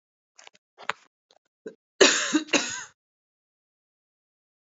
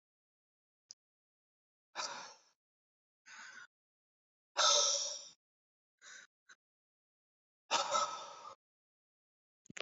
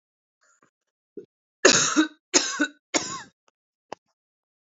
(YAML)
cough_length: 4.7 s
cough_amplitude: 28719
cough_signal_mean_std_ratio: 0.26
exhalation_length: 9.8 s
exhalation_amplitude: 4525
exhalation_signal_mean_std_ratio: 0.29
three_cough_length: 4.7 s
three_cough_amplitude: 28579
three_cough_signal_mean_std_ratio: 0.31
survey_phase: alpha (2021-03-01 to 2021-08-12)
age: 18-44
gender: Female
wearing_mask: 'No'
symptom_cough_any: true
symptom_fatigue: true
symptom_change_to_sense_of_smell_or_taste: true
symptom_loss_of_taste: true
smoker_status: Current smoker (e-cigarettes or vapes only)
respiratory_condition_asthma: false
respiratory_condition_other: false
recruitment_source: Test and Trace
submission_delay: 2 days
covid_test_result: Positive
covid_test_method: ePCR